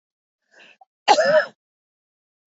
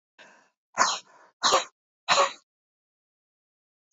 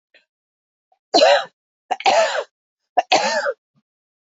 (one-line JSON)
{"cough_length": "2.5 s", "cough_amplitude": 25801, "cough_signal_mean_std_ratio": 0.31, "exhalation_length": "3.9 s", "exhalation_amplitude": 14706, "exhalation_signal_mean_std_ratio": 0.31, "three_cough_length": "4.3 s", "three_cough_amplitude": 26830, "three_cough_signal_mean_std_ratio": 0.41, "survey_phase": "beta (2021-08-13 to 2022-03-07)", "age": "65+", "gender": "Female", "wearing_mask": "No", "symptom_none": true, "smoker_status": "Never smoked", "respiratory_condition_asthma": false, "respiratory_condition_other": true, "recruitment_source": "Test and Trace", "submission_delay": "1 day", "covid_test_result": "Negative", "covid_test_method": "RT-qPCR"}